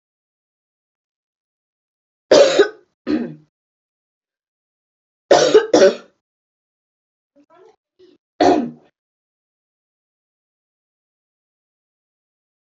{"three_cough_length": "12.8 s", "three_cough_amplitude": 29169, "three_cough_signal_mean_std_ratio": 0.25, "survey_phase": "beta (2021-08-13 to 2022-03-07)", "age": "18-44", "gender": "Female", "wearing_mask": "No", "symptom_runny_or_blocked_nose": true, "symptom_sore_throat": true, "symptom_fatigue": true, "symptom_other": true, "symptom_onset": "3 days", "smoker_status": "Never smoked", "respiratory_condition_asthma": false, "respiratory_condition_other": false, "recruitment_source": "Test and Trace", "submission_delay": "2 days", "covid_test_result": "Positive", "covid_test_method": "RT-qPCR", "covid_ct_value": 25.7, "covid_ct_gene": "N gene", "covid_ct_mean": 25.7, "covid_viral_load": "3600 copies/ml", "covid_viral_load_category": "Minimal viral load (< 10K copies/ml)"}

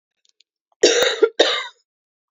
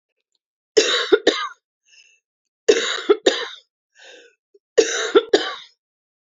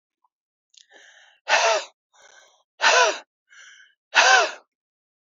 {"cough_length": "2.3 s", "cough_amplitude": 28341, "cough_signal_mean_std_ratio": 0.4, "three_cough_length": "6.2 s", "three_cough_amplitude": 30079, "three_cough_signal_mean_std_ratio": 0.36, "exhalation_length": "5.4 s", "exhalation_amplitude": 26371, "exhalation_signal_mean_std_ratio": 0.36, "survey_phase": "beta (2021-08-13 to 2022-03-07)", "age": "45-64", "gender": "Female", "wearing_mask": "No", "symptom_none": true, "smoker_status": "Never smoked", "respiratory_condition_asthma": false, "respiratory_condition_other": false, "recruitment_source": "REACT", "submission_delay": "1 day", "covid_test_result": "Negative", "covid_test_method": "RT-qPCR", "influenza_a_test_result": "Negative", "influenza_b_test_result": "Negative"}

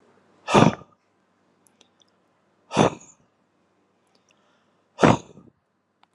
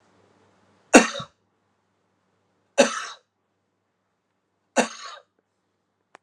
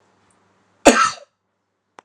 {"exhalation_length": "6.1 s", "exhalation_amplitude": 30556, "exhalation_signal_mean_std_ratio": 0.23, "three_cough_length": "6.2 s", "three_cough_amplitude": 32767, "three_cough_signal_mean_std_ratio": 0.19, "cough_length": "2.0 s", "cough_amplitude": 32768, "cough_signal_mean_std_ratio": 0.25, "survey_phase": "alpha (2021-03-01 to 2021-08-12)", "age": "45-64", "gender": "Male", "wearing_mask": "No", "symptom_none": true, "smoker_status": "Never smoked", "respiratory_condition_asthma": false, "respiratory_condition_other": false, "recruitment_source": "REACT", "submission_delay": "2 days", "covid_test_result": "Negative", "covid_test_method": "RT-qPCR"}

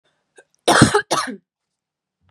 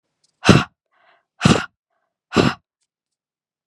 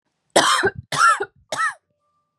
{"cough_length": "2.3 s", "cough_amplitude": 32768, "cough_signal_mean_std_ratio": 0.34, "exhalation_length": "3.7 s", "exhalation_amplitude": 32768, "exhalation_signal_mean_std_ratio": 0.27, "three_cough_length": "2.4 s", "three_cough_amplitude": 32687, "three_cough_signal_mean_std_ratio": 0.48, "survey_phase": "beta (2021-08-13 to 2022-03-07)", "age": "18-44", "gender": "Female", "wearing_mask": "No", "symptom_cough_any": true, "symptom_new_continuous_cough": true, "symptom_runny_or_blocked_nose": true, "symptom_sore_throat": true, "symptom_fever_high_temperature": true, "symptom_headache": true, "smoker_status": "Never smoked", "respiratory_condition_asthma": true, "respiratory_condition_other": false, "recruitment_source": "Test and Trace", "submission_delay": "2 days", "covid_test_result": "Positive", "covid_test_method": "RT-qPCR"}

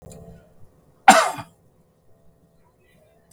{"cough_length": "3.3 s", "cough_amplitude": 32768, "cough_signal_mean_std_ratio": 0.21, "survey_phase": "beta (2021-08-13 to 2022-03-07)", "age": "65+", "gender": "Male", "wearing_mask": "No", "symptom_none": true, "smoker_status": "Ex-smoker", "respiratory_condition_asthma": false, "respiratory_condition_other": false, "recruitment_source": "REACT", "submission_delay": "2 days", "covid_test_result": "Negative", "covid_test_method": "RT-qPCR", "influenza_a_test_result": "Negative", "influenza_b_test_result": "Negative"}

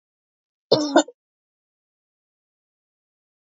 {"cough_length": "3.6 s", "cough_amplitude": 23982, "cough_signal_mean_std_ratio": 0.2, "survey_phase": "beta (2021-08-13 to 2022-03-07)", "age": "65+", "gender": "Female", "wearing_mask": "No", "symptom_none": true, "smoker_status": "Never smoked", "respiratory_condition_asthma": true, "respiratory_condition_other": false, "recruitment_source": "REACT", "submission_delay": "2 days", "covid_test_result": "Negative", "covid_test_method": "RT-qPCR", "influenza_a_test_result": "Negative", "influenza_b_test_result": "Negative"}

